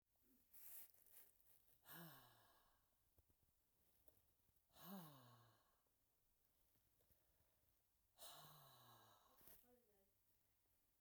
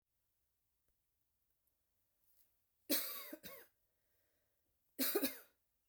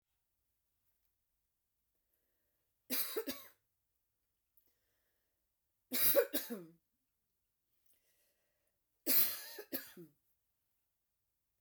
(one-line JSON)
{"exhalation_length": "11.0 s", "exhalation_amplitude": 276, "exhalation_signal_mean_std_ratio": 0.54, "cough_length": "5.9 s", "cough_amplitude": 2221, "cough_signal_mean_std_ratio": 0.28, "three_cough_length": "11.6 s", "three_cough_amplitude": 4998, "three_cough_signal_mean_std_ratio": 0.25, "survey_phase": "beta (2021-08-13 to 2022-03-07)", "age": "45-64", "gender": "Female", "wearing_mask": "No", "symptom_none": true, "smoker_status": "Never smoked", "respiratory_condition_asthma": false, "respiratory_condition_other": false, "recruitment_source": "REACT", "submission_delay": "1 day", "covid_test_result": "Negative", "covid_test_method": "RT-qPCR"}